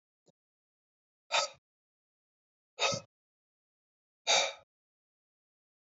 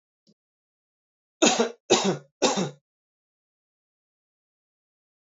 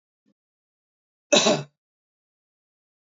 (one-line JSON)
{"exhalation_length": "5.9 s", "exhalation_amplitude": 6084, "exhalation_signal_mean_std_ratio": 0.24, "three_cough_length": "5.2 s", "three_cough_amplitude": 19202, "three_cough_signal_mean_std_ratio": 0.29, "cough_length": "3.1 s", "cough_amplitude": 19641, "cough_signal_mean_std_ratio": 0.23, "survey_phase": "alpha (2021-03-01 to 2021-08-12)", "age": "18-44", "gender": "Male", "wearing_mask": "No", "symptom_cough_any": true, "symptom_new_continuous_cough": true, "symptom_abdominal_pain": true, "symptom_fatigue": true, "symptom_fever_high_temperature": true, "symptom_headache": true, "symptom_onset": "3 days", "smoker_status": "Ex-smoker", "respiratory_condition_asthma": false, "respiratory_condition_other": false, "recruitment_source": "Test and Trace", "submission_delay": "2 days", "covid_test_result": "Positive", "covid_test_method": "RT-qPCR", "covid_ct_value": 21.2, "covid_ct_gene": "ORF1ab gene"}